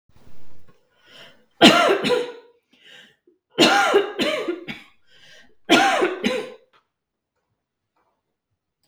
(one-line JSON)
{"three_cough_length": "8.9 s", "three_cough_amplitude": 32768, "three_cough_signal_mean_std_ratio": 0.42, "survey_phase": "beta (2021-08-13 to 2022-03-07)", "age": "18-44", "gender": "Female", "wearing_mask": "No", "symptom_none": true, "smoker_status": "Never smoked", "respiratory_condition_asthma": false, "respiratory_condition_other": false, "recruitment_source": "REACT", "submission_delay": "1 day", "covid_test_result": "Negative", "covid_test_method": "RT-qPCR", "influenza_a_test_result": "Unknown/Void", "influenza_b_test_result": "Unknown/Void"}